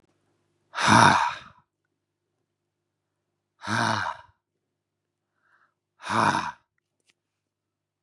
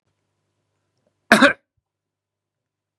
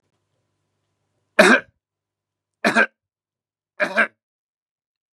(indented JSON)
{
  "exhalation_length": "8.0 s",
  "exhalation_amplitude": 30119,
  "exhalation_signal_mean_std_ratio": 0.3,
  "cough_length": "3.0 s",
  "cough_amplitude": 32767,
  "cough_signal_mean_std_ratio": 0.19,
  "three_cough_length": "5.1 s",
  "three_cough_amplitude": 32767,
  "three_cough_signal_mean_std_ratio": 0.26,
  "survey_phase": "beta (2021-08-13 to 2022-03-07)",
  "age": "45-64",
  "gender": "Male",
  "wearing_mask": "No",
  "symptom_sore_throat": true,
  "symptom_onset": "3 days",
  "smoker_status": "Ex-smoker",
  "respiratory_condition_asthma": false,
  "respiratory_condition_other": false,
  "recruitment_source": "REACT",
  "submission_delay": "2 days",
  "covid_test_result": "Negative",
  "covid_test_method": "RT-qPCR",
  "influenza_a_test_result": "Negative",
  "influenza_b_test_result": "Negative"
}